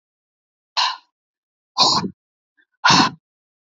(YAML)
exhalation_length: 3.7 s
exhalation_amplitude: 28631
exhalation_signal_mean_std_ratio: 0.35
survey_phase: beta (2021-08-13 to 2022-03-07)
age: 45-64
gender: Female
wearing_mask: 'No'
symptom_cough_any: true
symptom_runny_or_blocked_nose: true
symptom_sore_throat: true
symptom_fatigue: true
symptom_onset: 12 days
smoker_status: Never smoked
respiratory_condition_asthma: false
respiratory_condition_other: false
recruitment_source: REACT
submission_delay: 2 days
covid_test_result: Negative
covid_test_method: RT-qPCR
influenza_a_test_result: Negative
influenza_b_test_result: Negative